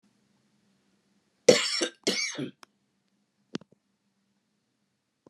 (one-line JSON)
{"cough_length": "5.3 s", "cough_amplitude": 26643, "cough_signal_mean_std_ratio": 0.23, "survey_phase": "beta (2021-08-13 to 2022-03-07)", "age": "65+", "gender": "Female", "wearing_mask": "No", "symptom_cough_any": true, "smoker_status": "Ex-smoker", "respiratory_condition_asthma": false, "respiratory_condition_other": false, "recruitment_source": "REACT", "submission_delay": "2 days", "covid_test_result": "Negative", "covid_test_method": "RT-qPCR", "influenza_a_test_result": "Negative", "influenza_b_test_result": "Negative"}